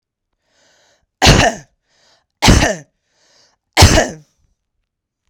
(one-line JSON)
{"three_cough_length": "5.3 s", "three_cough_amplitude": 32768, "three_cough_signal_mean_std_ratio": 0.33, "survey_phase": "beta (2021-08-13 to 2022-03-07)", "age": "18-44", "gender": "Female", "wearing_mask": "No", "symptom_none": true, "smoker_status": "Current smoker (11 or more cigarettes per day)", "respiratory_condition_asthma": false, "respiratory_condition_other": false, "recruitment_source": "REACT", "submission_delay": "2 days", "covid_test_result": "Negative", "covid_test_method": "RT-qPCR"}